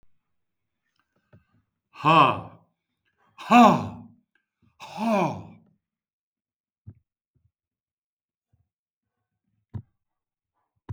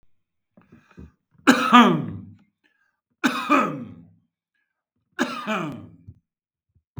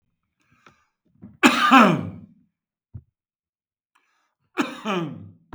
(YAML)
exhalation_length: 10.9 s
exhalation_amplitude: 23369
exhalation_signal_mean_std_ratio: 0.24
three_cough_length: 7.0 s
three_cough_amplitude: 32766
three_cough_signal_mean_std_ratio: 0.33
cough_length: 5.5 s
cough_amplitude: 32279
cough_signal_mean_std_ratio: 0.31
survey_phase: beta (2021-08-13 to 2022-03-07)
age: 65+
gender: Male
wearing_mask: 'No'
symptom_none: true
smoker_status: Never smoked
respiratory_condition_asthma: false
respiratory_condition_other: false
recruitment_source: REACT
submission_delay: 1 day
covid_test_result: Negative
covid_test_method: RT-qPCR
influenza_a_test_result: Negative
influenza_b_test_result: Negative